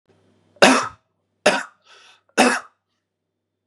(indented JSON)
{
  "three_cough_length": "3.7 s",
  "three_cough_amplitude": 32417,
  "three_cough_signal_mean_std_ratio": 0.31,
  "survey_phase": "beta (2021-08-13 to 2022-03-07)",
  "age": "45-64",
  "gender": "Male",
  "wearing_mask": "No",
  "symptom_none": true,
  "smoker_status": "Ex-smoker",
  "respiratory_condition_asthma": false,
  "respiratory_condition_other": false,
  "recruitment_source": "REACT",
  "submission_delay": "0 days",
  "covid_test_result": "Negative",
  "covid_test_method": "RT-qPCR",
  "influenza_a_test_result": "Negative",
  "influenza_b_test_result": "Negative"
}